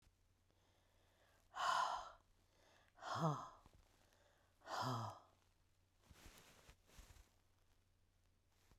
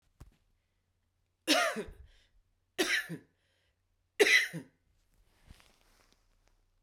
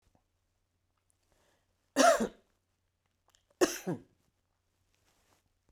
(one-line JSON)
{"exhalation_length": "8.8 s", "exhalation_amplitude": 1280, "exhalation_signal_mean_std_ratio": 0.36, "three_cough_length": "6.8 s", "three_cough_amplitude": 9477, "three_cough_signal_mean_std_ratio": 0.29, "cough_length": "5.7 s", "cough_amplitude": 9084, "cough_signal_mean_std_ratio": 0.22, "survey_phase": "beta (2021-08-13 to 2022-03-07)", "age": "45-64", "gender": "Female", "wearing_mask": "No", "symptom_none": true, "smoker_status": "Never smoked", "respiratory_condition_asthma": true, "respiratory_condition_other": false, "recruitment_source": "REACT", "submission_delay": "2 days", "covid_test_result": "Negative", "covid_test_method": "RT-qPCR"}